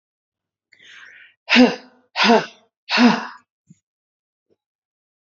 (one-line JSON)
{"exhalation_length": "5.2 s", "exhalation_amplitude": 27775, "exhalation_signal_mean_std_ratio": 0.31, "survey_phase": "alpha (2021-03-01 to 2021-08-12)", "age": "18-44", "gender": "Female", "wearing_mask": "No", "symptom_none": true, "smoker_status": "Never smoked", "respiratory_condition_asthma": false, "respiratory_condition_other": false, "recruitment_source": "REACT", "submission_delay": "1 day", "covid_test_result": "Negative", "covid_test_method": "RT-qPCR"}